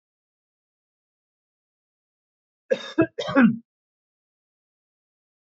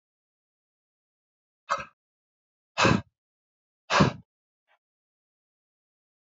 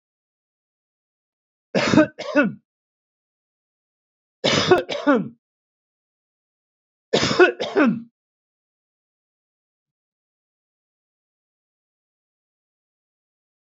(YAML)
cough_length: 5.5 s
cough_amplitude: 16764
cough_signal_mean_std_ratio: 0.22
exhalation_length: 6.4 s
exhalation_amplitude: 14104
exhalation_signal_mean_std_ratio: 0.22
three_cough_length: 13.7 s
three_cough_amplitude: 26170
three_cough_signal_mean_std_ratio: 0.28
survey_phase: beta (2021-08-13 to 2022-03-07)
age: 45-64
gender: Male
wearing_mask: 'No'
symptom_none: true
smoker_status: Ex-smoker
respiratory_condition_asthma: true
respiratory_condition_other: false
recruitment_source: REACT
submission_delay: 1 day
covid_test_result: Negative
covid_test_method: RT-qPCR
influenza_a_test_result: Negative
influenza_b_test_result: Negative